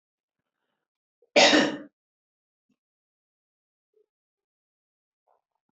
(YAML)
cough_length: 5.7 s
cough_amplitude: 18279
cough_signal_mean_std_ratio: 0.2
survey_phase: beta (2021-08-13 to 2022-03-07)
age: 45-64
gender: Female
wearing_mask: 'No'
symptom_none: true
smoker_status: Never smoked
respiratory_condition_asthma: false
respiratory_condition_other: false
recruitment_source: REACT
submission_delay: 2 days
covid_test_result: Negative
covid_test_method: RT-qPCR